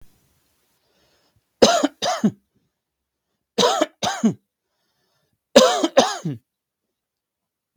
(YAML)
three_cough_length: 7.8 s
three_cough_amplitude: 32768
three_cough_signal_mean_std_ratio: 0.33
survey_phase: beta (2021-08-13 to 2022-03-07)
age: 18-44
gender: Male
wearing_mask: 'No'
symptom_none: true
smoker_status: Never smoked
respiratory_condition_asthma: false
respiratory_condition_other: false
recruitment_source: REACT
submission_delay: 2 days
covid_test_result: Negative
covid_test_method: RT-qPCR